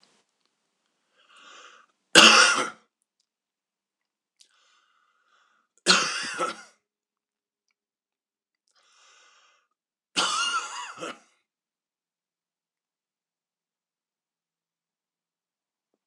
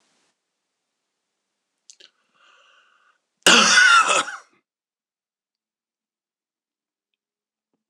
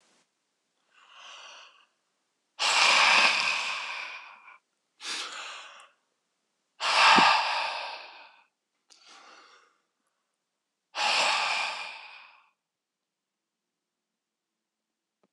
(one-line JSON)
{"three_cough_length": "16.1 s", "three_cough_amplitude": 26028, "three_cough_signal_mean_std_ratio": 0.21, "cough_length": "7.9 s", "cough_amplitude": 26028, "cough_signal_mean_std_ratio": 0.26, "exhalation_length": "15.3 s", "exhalation_amplitude": 14722, "exhalation_signal_mean_std_ratio": 0.38, "survey_phase": "beta (2021-08-13 to 2022-03-07)", "age": "45-64", "gender": "Male", "wearing_mask": "No", "symptom_none": true, "smoker_status": "Ex-smoker", "respiratory_condition_asthma": false, "respiratory_condition_other": false, "recruitment_source": "REACT", "submission_delay": "1 day", "covid_test_result": "Negative", "covid_test_method": "RT-qPCR"}